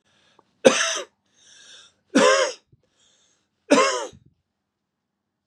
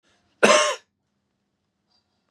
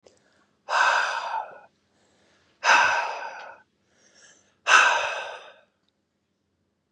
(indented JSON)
{
  "three_cough_length": "5.5 s",
  "three_cough_amplitude": 32078,
  "three_cough_signal_mean_std_ratio": 0.33,
  "cough_length": "2.3 s",
  "cough_amplitude": 31262,
  "cough_signal_mean_std_ratio": 0.28,
  "exhalation_length": "6.9 s",
  "exhalation_amplitude": 24911,
  "exhalation_signal_mean_std_ratio": 0.4,
  "survey_phase": "beta (2021-08-13 to 2022-03-07)",
  "age": "45-64",
  "gender": "Male",
  "wearing_mask": "No",
  "symptom_runny_or_blocked_nose": true,
  "symptom_other": true,
  "smoker_status": "Never smoked",
  "respiratory_condition_asthma": false,
  "respiratory_condition_other": false,
  "recruitment_source": "REACT",
  "submission_delay": "2 days",
  "covid_test_result": "Negative",
  "covid_test_method": "RT-qPCR",
  "influenza_a_test_result": "Negative",
  "influenza_b_test_result": "Negative"
}